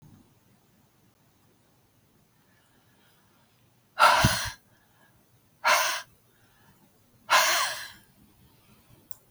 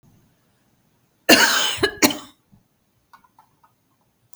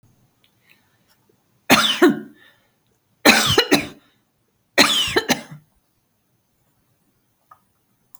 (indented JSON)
{
  "exhalation_length": "9.3 s",
  "exhalation_amplitude": 15338,
  "exhalation_signal_mean_std_ratio": 0.3,
  "cough_length": "4.4 s",
  "cough_amplitude": 32768,
  "cough_signal_mean_std_ratio": 0.3,
  "three_cough_length": "8.2 s",
  "three_cough_amplitude": 32768,
  "three_cough_signal_mean_std_ratio": 0.32,
  "survey_phase": "beta (2021-08-13 to 2022-03-07)",
  "age": "65+",
  "gender": "Female",
  "wearing_mask": "No",
  "symptom_cough_any": true,
  "symptom_runny_or_blocked_nose": true,
  "smoker_status": "Never smoked",
  "respiratory_condition_asthma": false,
  "respiratory_condition_other": false,
  "recruitment_source": "REACT",
  "submission_delay": "7 days",
  "covid_test_result": "Negative",
  "covid_test_method": "RT-qPCR",
  "influenza_a_test_result": "Negative",
  "influenza_b_test_result": "Negative"
}